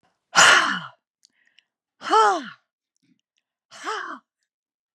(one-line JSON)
{"exhalation_length": "4.9 s", "exhalation_amplitude": 28289, "exhalation_signal_mean_std_ratio": 0.33, "survey_phase": "beta (2021-08-13 to 2022-03-07)", "age": "45-64", "gender": "Female", "wearing_mask": "No", "symptom_none": true, "smoker_status": "Never smoked", "respiratory_condition_asthma": false, "respiratory_condition_other": false, "recruitment_source": "REACT", "submission_delay": "1 day", "covid_test_result": "Negative", "covid_test_method": "RT-qPCR", "influenza_a_test_result": "Negative", "influenza_b_test_result": "Negative"}